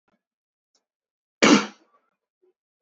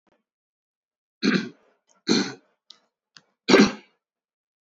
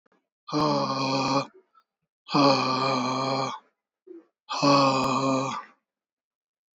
{"cough_length": "2.8 s", "cough_amplitude": 27141, "cough_signal_mean_std_ratio": 0.21, "three_cough_length": "4.6 s", "three_cough_amplitude": 27143, "three_cough_signal_mean_std_ratio": 0.28, "exhalation_length": "6.7 s", "exhalation_amplitude": 14068, "exhalation_signal_mean_std_ratio": 0.6, "survey_phase": "beta (2021-08-13 to 2022-03-07)", "age": "18-44", "gender": "Male", "wearing_mask": "No", "symptom_none": true, "smoker_status": "Never smoked", "respiratory_condition_asthma": false, "respiratory_condition_other": false, "recruitment_source": "REACT", "submission_delay": "3 days", "covid_test_result": "Negative", "covid_test_method": "RT-qPCR"}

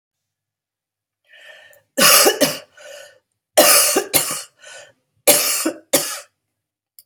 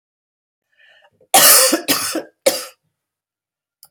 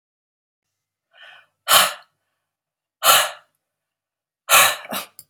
{"three_cough_length": "7.1 s", "three_cough_amplitude": 32768, "three_cough_signal_mean_std_ratio": 0.4, "cough_length": "3.9 s", "cough_amplitude": 32768, "cough_signal_mean_std_ratio": 0.35, "exhalation_length": "5.3 s", "exhalation_amplitude": 32768, "exhalation_signal_mean_std_ratio": 0.3, "survey_phase": "alpha (2021-03-01 to 2021-08-12)", "age": "45-64", "gender": "Female", "wearing_mask": "No", "symptom_cough_any": true, "smoker_status": "Ex-smoker", "respiratory_condition_asthma": false, "respiratory_condition_other": true, "recruitment_source": "REACT", "submission_delay": "2 days", "covid_test_result": "Negative", "covid_test_method": "RT-qPCR"}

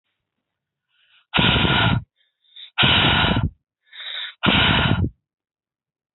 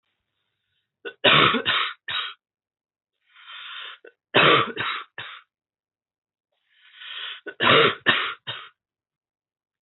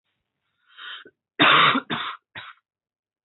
{"exhalation_length": "6.1 s", "exhalation_amplitude": 25790, "exhalation_signal_mean_std_ratio": 0.52, "three_cough_length": "9.8 s", "three_cough_amplitude": 23594, "three_cough_signal_mean_std_ratio": 0.37, "cough_length": "3.2 s", "cough_amplitude": 23991, "cough_signal_mean_std_ratio": 0.35, "survey_phase": "beta (2021-08-13 to 2022-03-07)", "age": "18-44", "gender": "Female", "wearing_mask": "No", "symptom_cough_any": true, "symptom_runny_or_blocked_nose": true, "symptom_shortness_of_breath": true, "symptom_fatigue": true, "symptom_fever_high_temperature": true, "symptom_change_to_sense_of_smell_or_taste": true, "symptom_loss_of_taste": true, "symptom_onset": "4 days", "smoker_status": "Current smoker (1 to 10 cigarettes per day)", "respiratory_condition_asthma": false, "respiratory_condition_other": false, "recruitment_source": "Test and Trace", "submission_delay": "2 days", "covid_test_result": "Positive", "covid_test_method": "RT-qPCR", "covid_ct_value": 14.3, "covid_ct_gene": "N gene", "covid_ct_mean": 14.6, "covid_viral_load": "16000000 copies/ml", "covid_viral_load_category": "High viral load (>1M copies/ml)"}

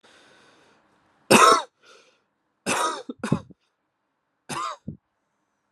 {"three_cough_length": "5.7 s", "three_cough_amplitude": 30636, "three_cough_signal_mean_std_ratio": 0.28, "survey_phase": "alpha (2021-03-01 to 2021-08-12)", "age": "18-44", "gender": "Male", "wearing_mask": "No", "symptom_cough_any": true, "symptom_fatigue": true, "symptom_fever_high_temperature": true, "symptom_headache": true, "symptom_onset": "2 days", "smoker_status": "Never smoked", "respiratory_condition_asthma": true, "respiratory_condition_other": false, "recruitment_source": "Test and Trace", "submission_delay": "1 day", "covid_test_result": "Positive", "covid_test_method": "RT-qPCR"}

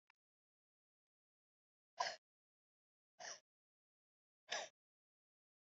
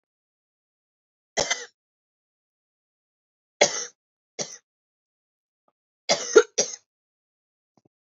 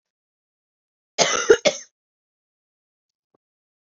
{"exhalation_length": "5.6 s", "exhalation_amplitude": 1844, "exhalation_signal_mean_std_ratio": 0.19, "three_cough_length": "8.0 s", "three_cough_amplitude": 26005, "three_cough_signal_mean_std_ratio": 0.19, "cough_length": "3.8 s", "cough_amplitude": 32459, "cough_signal_mean_std_ratio": 0.22, "survey_phase": "beta (2021-08-13 to 2022-03-07)", "age": "18-44", "gender": "Female", "wearing_mask": "No", "symptom_cough_any": true, "symptom_runny_or_blocked_nose": true, "symptom_shortness_of_breath": true, "symptom_onset": "4 days", "smoker_status": "Never smoked", "respiratory_condition_asthma": false, "respiratory_condition_other": false, "recruitment_source": "Test and Trace", "submission_delay": "-1 day", "covid_test_result": "Positive", "covid_test_method": "ePCR"}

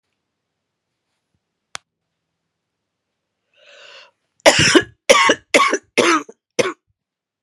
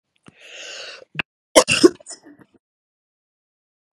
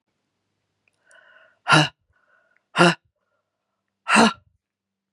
{"cough_length": "7.4 s", "cough_amplitude": 32768, "cough_signal_mean_std_ratio": 0.31, "three_cough_length": "3.9 s", "three_cough_amplitude": 32768, "three_cough_signal_mean_std_ratio": 0.21, "exhalation_length": "5.1 s", "exhalation_amplitude": 32015, "exhalation_signal_mean_std_ratio": 0.26, "survey_phase": "beta (2021-08-13 to 2022-03-07)", "age": "45-64", "gender": "Female", "wearing_mask": "No", "symptom_cough_any": true, "symptom_new_continuous_cough": true, "symptom_runny_or_blocked_nose": true, "symptom_sore_throat": true, "symptom_other": true, "smoker_status": "Never smoked", "respiratory_condition_asthma": false, "respiratory_condition_other": false, "recruitment_source": "Test and Trace", "submission_delay": "0 days", "covid_test_result": "Positive", "covid_test_method": "LFT"}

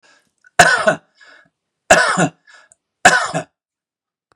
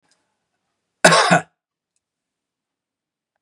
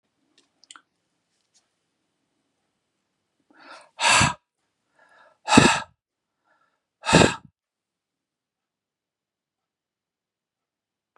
{"three_cough_length": "4.4 s", "three_cough_amplitude": 32768, "three_cough_signal_mean_std_ratio": 0.36, "cough_length": "3.4 s", "cough_amplitude": 32768, "cough_signal_mean_std_ratio": 0.24, "exhalation_length": "11.2 s", "exhalation_amplitude": 32768, "exhalation_signal_mean_std_ratio": 0.21, "survey_phase": "beta (2021-08-13 to 2022-03-07)", "age": "65+", "gender": "Male", "wearing_mask": "No", "symptom_none": true, "smoker_status": "Never smoked", "respiratory_condition_asthma": false, "respiratory_condition_other": false, "recruitment_source": "REACT", "submission_delay": "2 days", "covid_test_result": "Negative", "covid_test_method": "RT-qPCR", "influenza_a_test_result": "Negative", "influenza_b_test_result": "Negative"}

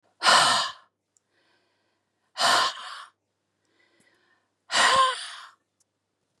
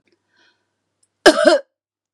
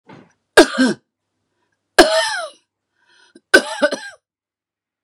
{"exhalation_length": "6.4 s", "exhalation_amplitude": 18550, "exhalation_signal_mean_std_ratio": 0.38, "cough_length": "2.1 s", "cough_amplitude": 32768, "cough_signal_mean_std_ratio": 0.29, "three_cough_length": "5.0 s", "three_cough_amplitude": 32768, "three_cough_signal_mean_std_ratio": 0.31, "survey_phase": "beta (2021-08-13 to 2022-03-07)", "age": "65+", "gender": "Male", "wearing_mask": "No", "symptom_cough_any": true, "symptom_runny_or_blocked_nose": true, "symptom_sore_throat": true, "symptom_fatigue": true, "smoker_status": "Never smoked", "respiratory_condition_asthma": false, "respiratory_condition_other": false, "recruitment_source": "Test and Trace", "submission_delay": "4 days", "covid_test_result": "Negative", "covid_test_method": "RT-qPCR"}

